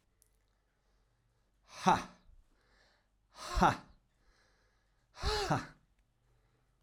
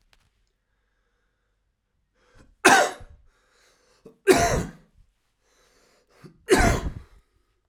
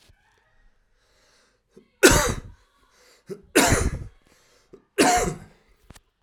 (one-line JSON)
{"exhalation_length": "6.8 s", "exhalation_amplitude": 7877, "exhalation_signal_mean_std_ratio": 0.28, "cough_length": "7.7 s", "cough_amplitude": 32767, "cough_signal_mean_std_ratio": 0.29, "three_cough_length": "6.2 s", "three_cough_amplitude": 32767, "three_cough_signal_mean_std_ratio": 0.33, "survey_phase": "alpha (2021-03-01 to 2021-08-12)", "age": "18-44", "gender": "Male", "wearing_mask": "No", "symptom_cough_any": true, "symptom_new_continuous_cough": true, "symptom_shortness_of_breath": true, "symptom_fatigue": true, "symptom_fever_high_temperature": true, "symptom_headache": true, "smoker_status": "Never smoked", "respiratory_condition_asthma": false, "respiratory_condition_other": false, "recruitment_source": "Test and Trace", "submission_delay": "2 days", "covid_test_result": "Positive", "covid_test_method": "RT-qPCR", "covid_ct_value": 34.5, "covid_ct_gene": "N gene"}